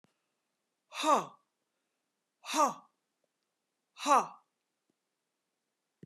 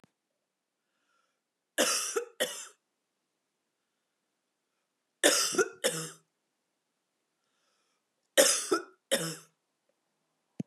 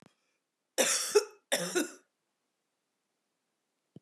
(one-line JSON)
{"exhalation_length": "6.1 s", "exhalation_amplitude": 7304, "exhalation_signal_mean_std_ratio": 0.25, "three_cough_length": "10.7 s", "three_cough_amplitude": 14319, "three_cough_signal_mean_std_ratio": 0.3, "cough_length": "4.0 s", "cough_amplitude": 8161, "cough_signal_mean_std_ratio": 0.32, "survey_phase": "beta (2021-08-13 to 2022-03-07)", "age": "45-64", "gender": "Female", "wearing_mask": "No", "symptom_cough_any": true, "symptom_runny_or_blocked_nose": true, "symptom_fatigue": true, "symptom_headache": true, "symptom_onset": "2 days", "smoker_status": "Never smoked", "respiratory_condition_asthma": false, "respiratory_condition_other": false, "recruitment_source": "Test and Trace", "submission_delay": "1 day", "covid_test_result": "Positive", "covid_test_method": "RT-qPCR", "covid_ct_value": 30.0, "covid_ct_gene": "ORF1ab gene"}